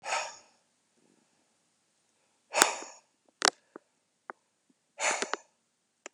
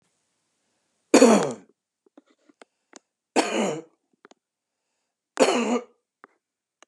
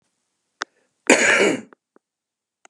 exhalation_length: 6.1 s
exhalation_amplitude: 32768
exhalation_signal_mean_std_ratio: 0.23
three_cough_length: 6.9 s
three_cough_amplitude: 25095
three_cough_signal_mean_std_ratio: 0.29
cough_length: 2.7 s
cough_amplitude: 32761
cough_signal_mean_std_ratio: 0.33
survey_phase: beta (2021-08-13 to 2022-03-07)
age: 45-64
gender: Male
wearing_mask: 'No'
symptom_none: true
smoker_status: Never smoked
respiratory_condition_asthma: false
respiratory_condition_other: false
recruitment_source: REACT
submission_delay: 13 days
covid_test_result: Negative
covid_test_method: RT-qPCR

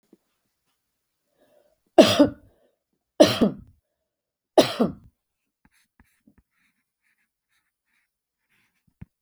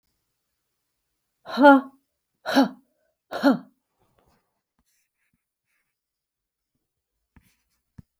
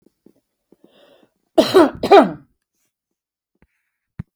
three_cough_length: 9.2 s
three_cough_amplitude: 32768
three_cough_signal_mean_std_ratio: 0.2
exhalation_length: 8.2 s
exhalation_amplitude: 26812
exhalation_signal_mean_std_ratio: 0.21
cough_length: 4.4 s
cough_amplitude: 32768
cough_signal_mean_std_ratio: 0.26
survey_phase: beta (2021-08-13 to 2022-03-07)
age: 65+
gender: Female
wearing_mask: 'No'
symptom_none: true
smoker_status: Never smoked
respiratory_condition_asthma: false
respiratory_condition_other: false
recruitment_source: REACT
submission_delay: 0 days
covid_test_result: Negative
covid_test_method: RT-qPCR
influenza_a_test_result: Negative
influenza_b_test_result: Negative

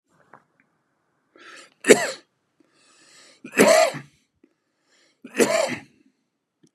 three_cough_length: 6.7 s
three_cough_amplitude: 32761
three_cough_signal_mean_std_ratio: 0.28
survey_phase: beta (2021-08-13 to 2022-03-07)
age: 65+
gender: Male
wearing_mask: 'No'
symptom_headache: true
smoker_status: Never smoked
respiratory_condition_asthma: false
respiratory_condition_other: false
recruitment_source: Test and Trace
submission_delay: 1 day
covid_test_result: Negative
covid_test_method: RT-qPCR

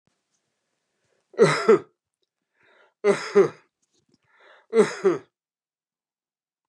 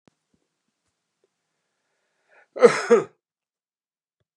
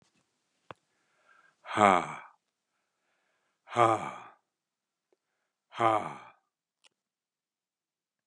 three_cough_length: 6.7 s
three_cough_amplitude: 22027
three_cough_signal_mean_std_ratio: 0.29
cough_length: 4.4 s
cough_amplitude: 31788
cough_signal_mean_std_ratio: 0.19
exhalation_length: 8.3 s
exhalation_amplitude: 19159
exhalation_signal_mean_std_ratio: 0.23
survey_phase: beta (2021-08-13 to 2022-03-07)
age: 65+
gender: Male
wearing_mask: 'No'
symptom_none: true
smoker_status: Ex-smoker
respiratory_condition_asthma: false
respiratory_condition_other: false
recruitment_source: REACT
submission_delay: 2 days
covid_test_result: Negative
covid_test_method: RT-qPCR
influenza_a_test_result: Negative
influenza_b_test_result: Negative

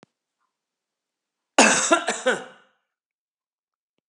cough_length: 4.1 s
cough_amplitude: 31906
cough_signal_mean_std_ratio: 0.29
survey_phase: beta (2021-08-13 to 2022-03-07)
age: 45-64
gender: Male
wearing_mask: 'No'
symptom_cough_any: true
symptom_runny_or_blocked_nose: true
symptom_onset: 6 days
smoker_status: Ex-smoker
respiratory_condition_asthma: false
respiratory_condition_other: false
recruitment_source: REACT
submission_delay: 2 days
covid_test_result: Negative
covid_test_method: RT-qPCR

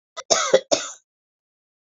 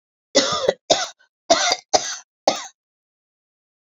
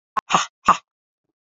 cough_length: 2.0 s
cough_amplitude: 27739
cough_signal_mean_std_ratio: 0.33
three_cough_length: 3.8 s
three_cough_amplitude: 31188
three_cough_signal_mean_std_ratio: 0.38
exhalation_length: 1.5 s
exhalation_amplitude: 27516
exhalation_signal_mean_std_ratio: 0.28
survey_phase: beta (2021-08-13 to 2022-03-07)
age: 45-64
gender: Female
wearing_mask: 'No'
symptom_cough_any: true
symptom_runny_or_blocked_nose: true
symptom_fatigue: true
symptom_headache: true
smoker_status: Never smoked
respiratory_condition_asthma: false
respiratory_condition_other: false
recruitment_source: Test and Trace
submission_delay: 2 days
covid_test_result: Positive
covid_test_method: RT-qPCR
covid_ct_value: 27.9
covid_ct_gene: ORF1ab gene
covid_ct_mean: 29.4
covid_viral_load: 230 copies/ml
covid_viral_load_category: Minimal viral load (< 10K copies/ml)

